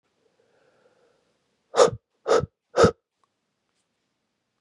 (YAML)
exhalation_length: 4.6 s
exhalation_amplitude: 26422
exhalation_signal_mean_std_ratio: 0.24
survey_phase: beta (2021-08-13 to 2022-03-07)
age: 18-44
gender: Male
wearing_mask: 'No'
symptom_none: true
symptom_onset: 6 days
smoker_status: Prefer not to say
respiratory_condition_asthma: false
respiratory_condition_other: false
recruitment_source: REACT
submission_delay: 16 days
covid_test_result: Negative
covid_test_method: RT-qPCR
influenza_a_test_result: Unknown/Void
influenza_b_test_result: Unknown/Void